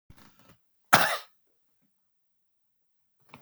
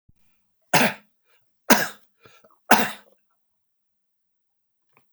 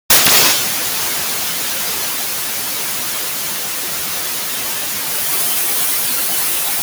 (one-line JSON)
{"cough_length": "3.4 s", "cough_amplitude": 32767, "cough_signal_mean_std_ratio": 0.2, "three_cough_length": "5.1 s", "three_cough_amplitude": 32768, "three_cough_signal_mean_std_ratio": 0.24, "exhalation_length": "6.8 s", "exhalation_amplitude": 32768, "exhalation_signal_mean_std_ratio": 1.12, "survey_phase": "beta (2021-08-13 to 2022-03-07)", "age": "65+", "gender": "Male", "wearing_mask": "No", "symptom_cough_any": true, "symptom_runny_or_blocked_nose": true, "symptom_abdominal_pain": true, "symptom_fatigue": true, "symptom_change_to_sense_of_smell_or_taste": true, "symptom_loss_of_taste": true, "smoker_status": "Current smoker (1 to 10 cigarettes per day)", "respiratory_condition_asthma": false, "respiratory_condition_other": false, "recruitment_source": "REACT", "submission_delay": "1 day", "covid_test_result": "Negative", "covid_test_method": "RT-qPCR", "influenza_a_test_result": "Negative", "influenza_b_test_result": "Negative"}